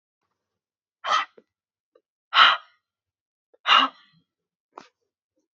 {"exhalation_length": "5.5 s", "exhalation_amplitude": 25983, "exhalation_signal_mean_std_ratio": 0.25, "survey_phase": "beta (2021-08-13 to 2022-03-07)", "age": "18-44", "gender": "Female", "wearing_mask": "No", "symptom_sore_throat": true, "symptom_onset": "3 days", "smoker_status": "Never smoked", "respiratory_condition_asthma": false, "respiratory_condition_other": false, "recruitment_source": "Test and Trace", "submission_delay": "1 day", "covid_test_result": "Negative", "covid_test_method": "ePCR"}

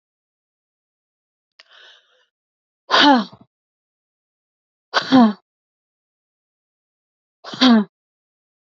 {"exhalation_length": "8.7 s", "exhalation_amplitude": 30488, "exhalation_signal_mean_std_ratio": 0.26, "survey_phase": "beta (2021-08-13 to 2022-03-07)", "age": "18-44", "gender": "Female", "wearing_mask": "No", "symptom_cough_any": true, "symptom_sore_throat": true, "symptom_abdominal_pain": true, "symptom_fever_high_temperature": true, "symptom_headache": true, "smoker_status": "Never smoked", "respiratory_condition_asthma": false, "respiratory_condition_other": false, "recruitment_source": "Test and Trace", "submission_delay": "1 day", "covid_test_result": "Positive", "covid_test_method": "LFT"}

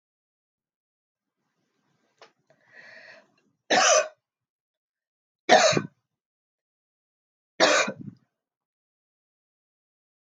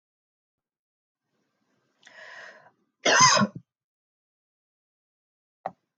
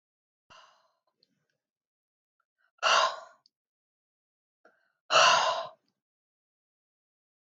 {"three_cough_length": "10.2 s", "three_cough_amplitude": 20830, "three_cough_signal_mean_std_ratio": 0.25, "cough_length": "6.0 s", "cough_amplitude": 20794, "cough_signal_mean_std_ratio": 0.23, "exhalation_length": "7.5 s", "exhalation_amplitude": 12216, "exhalation_signal_mean_std_ratio": 0.26, "survey_phase": "alpha (2021-03-01 to 2021-08-12)", "age": "45-64", "gender": "Female", "wearing_mask": "No", "symptom_none": true, "smoker_status": "Never smoked", "respiratory_condition_asthma": false, "respiratory_condition_other": false, "recruitment_source": "REACT", "submission_delay": "3 days", "covid_test_result": "Negative", "covid_test_method": "RT-qPCR"}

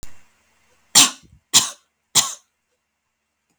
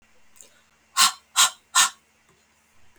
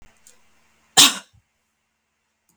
{"three_cough_length": "3.6 s", "three_cough_amplitude": 32766, "three_cough_signal_mean_std_ratio": 0.27, "exhalation_length": "3.0 s", "exhalation_amplitude": 25252, "exhalation_signal_mean_std_ratio": 0.3, "cough_length": "2.6 s", "cough_amplitude": 32768, "cough_signal_mean_std_ratio": 0.2, "survey_phase": "beta (2021-08-13 to 2022-03-07)", "age": "45-64", "gender": "Female", "wearing_mask": "No", "symptom_none": true, "smoker_status": "Never smoked", "respiratory_condition_asthma": false, "respiratory_condition_other": false, "recruitment_source": "REACT", "submission_delay": "1 day", "covid_test_result": "Negative", "covid_test_method": "RT-qPCR"}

